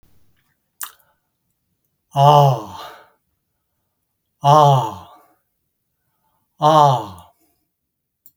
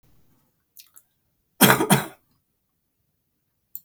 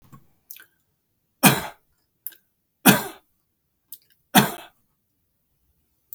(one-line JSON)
{"exhalation_length": "8.4 s", "exhalation_amplitude": 32768, "exhalation_signal_mean_std_ratio": 0.33, "cough_length": "3.8 s", "cough_amplitude": 32768, "cough_signal_mean_std_ratio": 0.24, "three_cough_length": "6.1 s", "three_cough_amplitude": 32768, "three_cough_signal_mean_std_ratio": 0.21, "survey_phase": "beta (2021-08-13 to 2022-03-07)", "age": "45-64", "gender": "Male", "wearing_mask": "No", "symptom_cough_any": true, "smoker_status": "Ex-smoker", "respiratory_condition_asthma": false, "respiratory_condition_other": true, "recruitment_source": "REACT", "submission_delay": "2 days", "covid_test_result": "Negative", "covid_test_method": "RT-qPCR", "influenza_a_test_result": "Negative", "influenza_b_test_result": "Negative"}